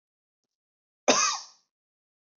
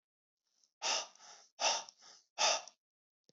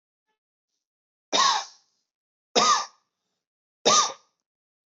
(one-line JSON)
{"cough_length": "2.4 s", "cough_amplitude": 15914, "cough_signal_mean_std_ratio": 0.27, "exhalation_length": "3.3 s", "exhalation_amplitude": 3892, "exhalation_signal_mean_std_ratio": 0.37, "three_cough_length": "4.9 s", "three_cough_amplitude": 18413, "three_cough_signal_mean_std_ratio": 0.33, "survey_phase": "beta (2021-08-13 to 2022-03-07)", "age": "18-44", "gender": "Male", "wearing_mask": "No", "symptom_none": true, "smoker_status": "Never smoked", "respiratory_condition_asthma": false, "respiratory_condition_other": false, "recruitment_source": "REACT", "submission_delay": "2 days", "covid_test_result": "Negative", "covid_test_method": "RT-qPCR", "influenza_a_test_result": "Negative", "influenza_b_test_result": "Negative"}